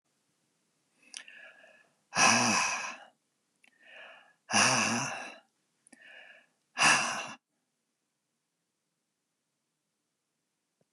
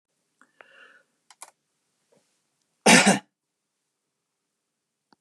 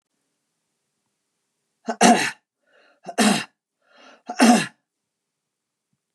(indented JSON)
{
  "exhalation_length": "10.9 s",
  "exhalation_amplitude": 12238,
  "exhalation_signal_mean_std_ratio": 0.33,
  "cough_length": "5.2 s",
  "cough_amplitude": 25568,
  "cough_signal_mean_std_ratio": 0.19,
  "three_cough_length": "6.1 s",
  "three_cough_amplitude": 32669,
  "three_cough_signal_mean_std_ratio": 0.29,
  "survey_phase": "beta (2021-08-13 to 2022-03-07)",
  "age": "65+",
  "gender": "Male",
  "wearing_mask": "No",
  "symptom_none": true,
  "smoker_status": "Never smoked",
  "respiratory_condition_asthma": false,
  "respiratory_condition_other": false,
  "recruitment_source": "REACT",
  "submission_delay": "2 days",
  "covid_test_result": "Negative",
  "covid_test_method": "RT-qPCR"
}